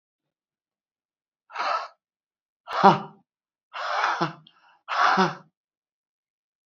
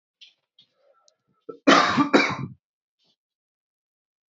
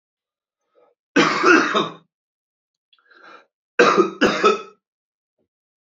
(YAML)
exhalation_length: 6.7 s
exhalation_amplitude: 27028
exhalation_signal_mean_std_ratio: 0.33
cough_length: 4.4 s
cough_amplitude: 25815
cough_signal_mean_std_ratio: 0.29
three_cough_length: 5.8 s
three_cough_amplitude: 27179
three_cough_signal_mean_std_ratio: 0.38
survey_phase: alpha (2021-03-01 to 2021-08-12)
age: 18-44
gender: Male
wearing_mask: 'No'
symptom_cough_any: true
symptom_shortness_of_breath: true
symptom_abdominal_pain: true
symptom_fatigue: true
symptom_headache: true
symptom_change_to_sense_of_smell_or_taste: true
symptom_loss_of_taste: true
symptom_onset: 4 days
smoker_status: Current smoker (11 or more cigarettes per day)
respiratory_condition_asthma: false
respiratory_condition_other: false
recruitment_source: Test and Trace
submission_delay: 2 days
covid_test_result: Positive
covid_test_method: RT-qPCR
covid_ct_value: 14.7
covid_ct_gene: ORF1ab gene
covid_ct_mean: 15.4
covid_viral_load: 9100000 copies/ml
covid_viral_load_category: High viral load (>1M copies/ml)